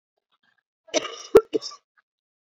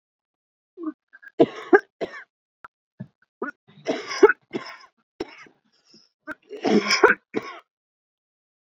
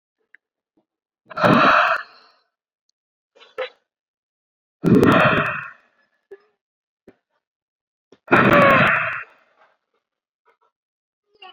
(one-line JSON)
{"cough_length": "2.5 s", "cough_amplitude": 27992, "cough_signal_mean_std_ratio": 0.21, "three_cough_length": "8.8 s", "three_cough_amplitude": 27120, "three_cough_signal_mean_std_ratio": 0.26, "exhalation_length": "11.5 s", "exhalation_amplitude": 32767, "exhalation_signal_mean_std_ratio": 0.36, "survey_phase": "beta (2021-08-13 to 2022-03-07)", "age": "18-44", "gender": "Female", "wearing_mask": "No", "symptom_cough_any": true, "symptom_new_continuous_cough": true, "symptom_runny_or_blocked_nose": true, "symptom_shortness_of_breath": true, "symptom_sore_throat": true, "symptom_abdominal_pain": true, "symptom_fever_high_temperature": true, "symptom_headache": true, "symptom_change_to_sense_of_smell_or_taste": true, "symptom_loss_of_taste": true, "symptom_onset": "3 days", "smoker_status": "Never smoked", "respiratory_condition_asthma": false, "respiratory_condition_other": false, "recruitment_source": "Test and Trace", "submission_delay": "2 days", "covid_test_result": "Positive", "covid_test_method": "RT-qPCR"}